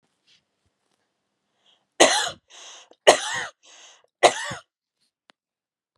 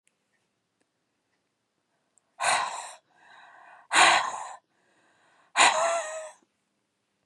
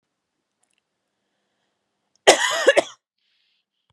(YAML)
three_cough_length: 6.0 s
three_cough_amplitude: 32767
three_cough_signal_mean_std_ratio: 0.24
exhalation_length: 7.3 s
exhalation_amplitude: 16869
exhalation_signal_mean_std_ratio: 0.33
cough_length: 3.9 s
cough_amplitude: 32768
cough_signal_mean_std_ratio: 0.24
survey_phase: beta (2021-08-13 to 2022-03-07)
age: 18-44
gender: Female
wearing_mask: 'No'
symptom_none: true
smoker_status: Never smoked
respiratory_condition_asthma: false
respiratory_condition_other: false
recruitment_source: REACT
submission_delay: 1 day
covid_test_result: Negative
covid_test_method: RT-qPCR
influenza_a_test_result: Negative
influenza_b_test_result: Negative